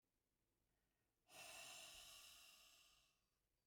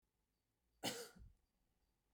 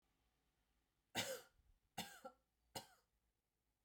{"exhalation_length": "3.7 s", "exhalation_amplitude": 155, "exhalation_signal_mean_std_ratio": 0.59, "cough_length": "2.1 s", "cough_amplitude": 993, "cough_signal_mean_std_ratio": 0.3, "three_cough_length": "3.8 s", "three_cough_amplitude": 1184, "three_cough_signal_mean_std_ratio": 0.3, "survey_phase": "beta (2021-08-13 to 2022-03-07)", "age": "45-64", "gender": "Female", "wearing_mask": "No", "symptom_none": true, "smoker_status": "Never smoked", "respiratory_condition_asthma": false, "respiratory_condition_other": false, "recruitment_source": "REACT", "submission_delay": "0 days", "covid_test_result": "Negative", "covid_test_method": "RT-qPCR"}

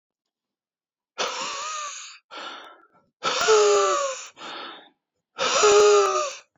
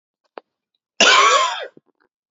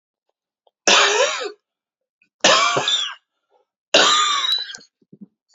{"exhalation_length": "6.6 s", "exhalation_amplitude": 18485, "exhalation_signal_mean_std_ratio": 0.53, "cough_length": "2.3 s", "cough_amplitude": 29380, "cough_signal_mean_std_ratio": 0.42, "three_cough_length": "5.5 s", "three_cough_amplitude": 30382, "three_cough_signal_mean_std_ratio": 0.49, "survey_phase": "beta (2021-08-13 to 2022-03-07)", "age": "18-44", "gender": "Male", "wearing_mask": "No", "symptom_new_continuous_cough": true, "symptom_runny_or_blocked_nose": true, "symptom_fatigue": true, "symptom_fever_high_temperature": true, "symptom_headache": true, "symptom_onset": "3 days", "smoker_status": "Ex-smoker", "respiratory_condition_asthma": true, "respiratory_condition_other": false, "recruitment_source": "Test and Trace", "submission_delay": "2 days", "covid_test_result": "Positive", "covid_test_method": "ePCR"}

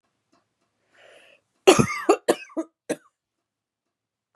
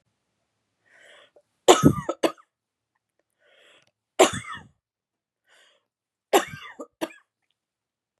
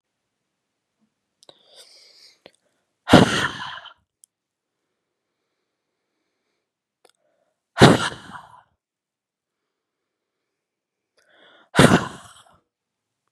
{"cough_length": "4.4 s", "cough_amplitude": 29748, "cough_signal_mean_std_ratio": 0.24, "three_cough_length": "8.2 s", "three_cough_amplitude": 32707, "three_cough_signal_mean_std_ratio": 0.21, "exhalation_length": "13.3 s", "exhalation_amplitude": 32768, "exhalation_signal_mean_std_ratio": 0.19, "survey_phase": "beta (2021-08-13 to 2022-03-07)", "age": "18-44", "gender": "Female", "wearing_mask": "No", "symptom_cough_any": true, "symptom_runny_or_blocked_nose": true, "symptom_fatigue": true, "smoker_status": "Never smoked", "respiratory_condition_asthma": false, "respiratory_condition_other": false, "recruitment_source": "Test and Trace", "submission_delay": "0 days", "covid_test_result": "Negative", "covid_test_method": "LFT"}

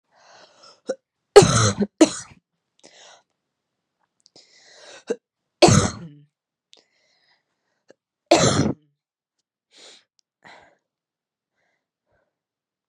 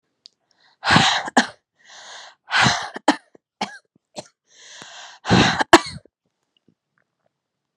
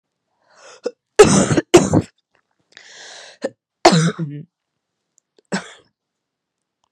{"three_cough_length": "12.9 s", "three_cough_amplitude": 32768, "three_cough_signal_mean_std_ratio": 0.23, "exhalation_length": "7.8 s", "exhalation_amplitude": 32768, "exhalation_signal_mean_std_ratio": 0.32, "cough_length": "6.9 s", "cough_amplitude": 32768, "cough_signal_mean_std_ratio": 0.3, "survey_phase": "beta (2021-08-13 to 2022-03-07)", "age": "18-44", "gender": "Female", "wearing_mask": "No", "symptom_runny_or_blocked_nose": true, "symptom_sore_throat": true, "symptom_onset": "5 days", "smoker_status": "Never smoked", "respiratory_condition_asthma": false, "respiratory_condition_other": false, "recruitment_source": "REACT", "submission_delay": "6 days", "covid_test_result": "Negative", "covid_test_method": "RT-qPCR", "influenza_a_test_result": "Negative", "influenza_b_test_result": "Negative"}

